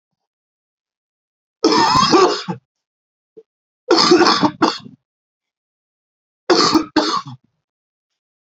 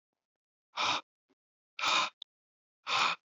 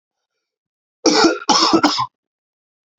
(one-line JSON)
{"three_cough_length": "8.4 s", "three_cough_amplitude": 32767, "three_cough_signal_mean_std_ratio": 0.41, "exhalation_length": "3.2 s", "exhalation_amplitude": 5111, "exhalation_signal_mean_std_ratio": 0.41, "cough_length": "3.0 s", "cough_amplitude": 32180, "cough_signal_mean_std_ratio": 0.43, "survey_phase": "alpha (2021-03-01 to 2021-08-12)", "age": "18-44", "gender": "Male", "wearing_mask": "No", "symptom_cough_any": true, "symptom_fatigue": true, "symptom_headache": true, "symptom_onset": "3 days", "smoker_status": "Never smoked", "respiratory_condition_asthma": false, "respiratory_condition_other": false, "recruitment_source": "Test and Trace", "submission_delay": "2 days", "covid_test_result": "Positive", "covid_test_method": "RT-qPCR", "covid_ct_value": 18.6, "covid_ct_gene": "ORF1ab gene", "covid_ct_mean": 19.4, "covid_viral_load": "430000 copies/ml", "covid_viral_load_category": "Low viral load (10K-1M copies/ml)"}